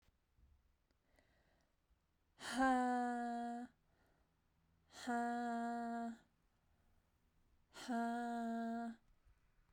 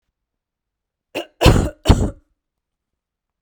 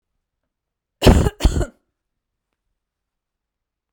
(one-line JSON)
{"exhalation_length": "9.7 s", "exhalation_amplitude": 2025, "exhalation_signal_mean_std_ratio": 0.52, "three_cough_length": "3.4 s", "three_cough_amplitude": 32768, "three_cough_signal_mean_std_ratio": 0.29, "cough_length": "3.9 s", "cough_amplitude": 32768, "cough_signal_mean_std_ratio": 0.25, "survey_phase": "beta (2021-08-13 to 2022-03-07)", "age": "18-44", "gender": "Female", "wearing_mask": "No", "symptom_cough_any": true, "symptom_runny_or_blocked_nose": true, "symptom_shortness_of_breath": true, "symptom_diarrhoea": true, "symptom_fatigue": true, "symptom_change_to_sense_of_smell_or_taste": true, "symptom_loss_of_taste": true, "symptom_onset": "3 days", "smoker_status": "Never smoked", "respiratory_condition_asthma": false, "respiratory_condition_other": false, "recruitment_source": "Test and Trace", "submission_delay": "2 days", "covid_test_result": "Positive", "covid_test_method": "ePCR"}